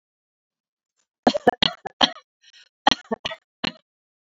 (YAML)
cough_length: 4.4 s
cough_amplitude: 29207
cough_signal_mean_std_ratio: 0.21
survey_phase: beta (2021-08-13 to 2022-03-07)
age: 45-64
gender: Female
wearing_mask: 'No'
symptom_none: true
smoker_status: Ex-smoker
respiratory_condition_asthma: false
respiratory_condition_other: false
recruitment_source: REACT
submission_delay: 1 day
covid_test_result: Negative
covid_test_method: RT-qPCR
influenza_a_test_result: Negative
influenza_b_test_result: Negative